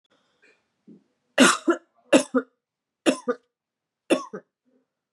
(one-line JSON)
{"three_cough_length": "5.1 s", "three_cough_amplitude": 27808, "three_cough_signal_mean_std_ratio": 0.28, "survey_phase": "beta (2021-08-13 to 2022-03-07)", "age": "18-44", "gender": "Female", "wearing_mask": "No", "symptom_cough_any": true, "symptom_headache": true, "smoker_status": "Never smoked", "respiratory_condition_asthma": false, "respiratory_condition_other": false, "recruitment_source": "Test and Trace", "submission_delay": "2 days", "covid_test_result": "Positive", "covid_test_method": "ePCR"}